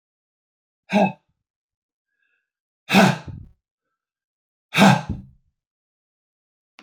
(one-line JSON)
{"exhalation_length": "6.8 s", "exhalation_amplitude": 25694, "exhalation_signal_mean_std_ratio": 0.26, "survey_phase": "alpha (2021-03-01 to 2021-08-12)", "age": "45-64", "gender": "Male", "wearing_mask": "No", "symptom_none": true, "smoker_status": "Never smoked", "respiratory_condition_asthma": false, "respiratory_condition_other": false, "recruitment_source": "REACT", "submission_delay": "2 days", "covid_test_result": "Negative", "covid_test_method": "RT-qPCR"}